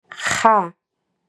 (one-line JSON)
{"exhalation_length": "1.3 s", "exhalation_amplitude": 32102, "exhalation_signal_mean_std_ratio": 0.42, "survey_phase": "beta (2021-08-13 to 2022-03-07)", "age": "18-44", "gender": "Female", "wearing_mask": "No", "symptom_cough_any": true, "symptom_new_continuous_cough": true, "symptom_runny_or_blocked_nose": true, "symptom_diarrhoea": true, "symptom_fatigue": true, "symptom_change_to_sense_of_smell_or_taste": true, "symptom_loss_of_taste": true, "symptom_onset": "5 days", "smoker_status": "Ex-smoker", "respiratory_condition_asthma": false, "respiratory_condition_other": true, "recruitment_source": "Test and Trace", "submission_delay": "2 days", "covid_test_result": "Positive", "covid_test_method": "RT-qPCR", "covid_ct_value": 15.5, "covid_ct_gene": "ORF1ab gene", "covid_ct_mean": 15.7, "covid_viral_load": "7000000 copies/ml", "covid_viral_load_category": "High viral load (>1M copies/ml)"}